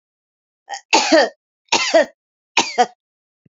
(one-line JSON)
{"three_cough_length": "3.5 s", "three_cough_amplitude": 31237, "three_cough_signal_mean_std_ratio": 0.39, "survey_phase": "beta (2021-08-13 to 2022-03-07)", "age": "65+", "gender": "Female", "wearing_mask": "No", "symptom_none": true, "smoker_status": "Never smoked", "respiratory_condition_asthma": false, "respiratory_condition_other": false, "recruitment_source": "REACT", "submission_delay": "2 days", "covid_test_result": "Negative", "covid_test_method": "RT-qPCR", "influenza_a_test_result": "Negative", "influenza_b_test_result": "Negative"}